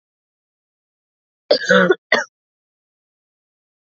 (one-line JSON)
{"cough_length": "3.8 s", "cough_amplitude": 27876, "cough_signal_mean_std_ratio": 0.27, "survey_phase": "alpha (2021-03-01 to 2021-08-12)", "age": "18-44", "gender": "Female", "wearing_mask": "No", "symptom_cough_any": true, "symptom_new_continuous_cough": true, "symptom_fatigue": true, "symptom_change_to_sense_of_smell_or_taste": true, "symptom_onset": "3 days", "smoker_status": "Never smoked", "respiratory_condition_asthma": false, "respiratory_condition_other": false, "recruitment_source": "Test and Trace", "submission_delay": "1 day", "covid_test_result": "Positive", "covid_test_method": "RT-qPCR", "covid_ct_value": 21.6, "covid_ct_gene": "ORF1ab gene", "covid_ct_mean": 22.1, "covid_viral_load": "58000 copies/ml", "covid_viral_load_category": "Low viral load (10K-1M copies/ml)"}